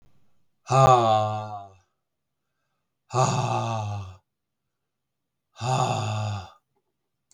exhalation_length: 7.3 s
exhalation_amplitude: 20216
exhalation_signal_mean_std_ratio: 0.45
survey_phase: beta (2021-08-13 to 2022-03-07)
age: 45-64
gender: Male
wearing_mask: 'No'
symptom_cough_any: true
smoker_status: Never smoked
respiratory_condition_asthma: false
respiratory_condition_other: false
recruitment_source: REACT
submission_delay: 4 days
covid_test_result: Negative
covid_test_method: RT-qPCR
influenza_a_test_result: Negative
influenza_b_test_result: Negative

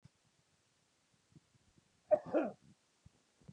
cough_length: 3.5 s
cough_amplitude: 3958
cough_signal_mean_std_ratio: 0.22
survey_phase: beta (2021-08-13 to 2022-03-07)
age: 45-64
gender: Male
wearing_mask: 'No'
symptom_none: true
smoker_status: Never smoked
respiratory_condition_asthma: false
respiratory_condition_other: false
recruitment_source: REACT
submission_delay: 4 days
covid_test_result: Negative
covid_test_method: RT-qPCR
influenza_a_test_result: Unknown/Void
influenza_b_test_result: Unknown/Void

